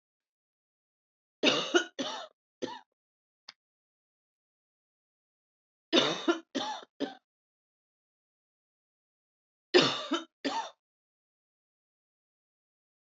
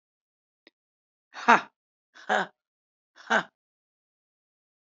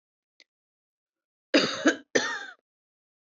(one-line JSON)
{"three_cough_length": "13.1 s", "three_cough_amplitude": 14236, "three_cough_signal_mean_std_ratio": 0.26, "exhalation_length": "4.9 s", "exhalation_amplitude": 25196, "exhalation_signal_mean_std_ratio": 0.2, "cough_length": "3.2 s", "cough_amplitude": 13184, "cough_signal_mean_std_ratio": 0.31, "survey_phase": "beta (2021-08-13 to 2022-03-07)", "age": "45-64", "gender": "Female", "wearing_mask": "No", "symptom_cough_any": true, "symptom_new_continuous_cough": true, "symptom_sore_throat": true, "symptom_fatigue": true, "symptom_headache": true, "smoker_status": "Current smoker (1 to 10 cigarettes per day)", "respiratory_condition_asthma": false, "respiratory_condition_other": false, "recruitment_source": "Test and Trace", "submission_delay": "2 days", "covid_test_result": "Positive", "covid_test_method": "RT-qPCR", "covid_ct_value": 13.3, "covid_ct_gene": "ORF1ab gene", "covid_ct_mean": 14.7, "covid_viral_load": "15000000 copies/ml", "covid_viral_load_category": "High viral load (>1M copies/ml)"}